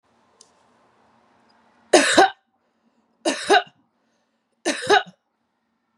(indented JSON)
{
  "three_cough_length": "6.0 s",
  "three_cough_amplitude": 32767,
  "three_cough_signal_mean_std_ratio": 0.29,
  "survey_phase": "beta (2021-08-13 to 2022-03-07)",
  "age": "18-44",
  "gender": "Female",
  "wearing_mask": "No",
  "symptom_runny_or_blocked_nose": true,
  "symptom_sore_throat": true,
  "symptom_fatigue": true,
  "symptom_other": true,
  "symptom_onset": "6 days",
  "smoker_status": "Ex-smoker",
  "respiratory_condition_asthma": false,
  "respiratory_condition_other": false,
  "recruitment_source": "Test and Trace",
  "submission_delay": "2 days",
  "covid_test_result": "Positive",
  "covid_test_method": "RT-qPCR",
  "covid_ct_value": 16.3,
  "covid_ct_gene": "N gene",
  "covid_ct_mean": 16.4,
  "covid_viral_load": "4300000 copies/ml",
  "covid_viral_load_category": "High viral load (>1M copies/ml)"
}